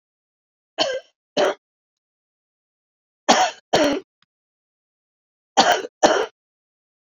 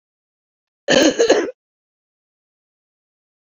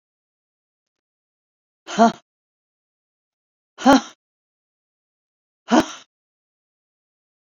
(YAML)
three_cough_length: 7.1 s
three_cough_amplitude: 29839
three_cough_signal_mean_std_ratio: 0.33
cough_length: 3.4 s
cough_amplitude: 32767
cough_signal_mean_std_ratio: 0.31
exhalation_length: 7.4 s
exhalation_amplitude: 27273
exhalation_signal_mean_std_ratio: 0.19
survey_phase: beta (2021-08-13 to 2022-03-07)
age: 65+
gender: Female
wearing_mask: 'No'
symptom_cough_any: true
symptom_shortness_of_breath: true
symptom_abdominal_pain: true
symptom_diarrhoea: true
symptom_fatigue: true
symptom_headache: true
smoker_status: Never smoked
respiratory_condition_asthma: false
respiratory_condition_other: false
recruitment_source: Test and Trace
submission_delay: 1 day
covid_test_result: Positive
covid_test_method: LFT